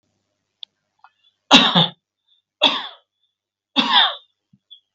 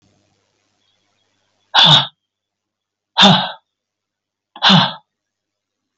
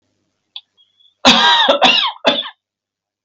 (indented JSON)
{
  "three_cough_length": "4.9 s",
  "three_cough_amplitude": 32768,
  "three_cough_signal_mean_std_ratio": 0.32,
  "exhalation_length": "6.0 s",
  "exhalation_amplitude": 32767,
  "exhalation_signal_mean_std_ratio": 0.31,
  "cough_length": "3.2 s",
  "cough_amplitude": 32768,
  "cough_signal_mean_std_ratio": 0.47,
  "survey_phase": "beta (2021-08-13 to 2022-03-07)",
  "age": "65+",
  "gender": "Male",
  "wearing_mask": "No",
  "symptom_none": true,
  "smoker_status": "Ex-smoker",
  "respiratory_condition_asthma": false,
  "respiratory_condition_other": false,
  "recruitment_source": "REACT",
  "submission_delay": "2 days",
  "covid_test_result": "Negative",
  "covid_test_method": "RT-qPCR"
}